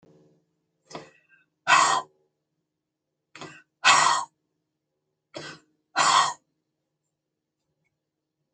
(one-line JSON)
{"exhalation_length": "8.5 s", "exhalation_amplitude": 22534, "exhalation_signal_mean_std_ratio": 0.29, "survey_phase": "alpha (2021-03-01 to 2021-08-12)", "age": "65+", "gender": "Female", "wearing_mask": "No", "symptom_none": true, "smoker_status": "Never smoked", "respiratory_condition_asthma": false, "respiratory_condition_other": false, "recruitment_source": "REACT", "submission_delay": "1 day", "covid_test_result": "Negative", "covid_test_method": "RT-qPCR"}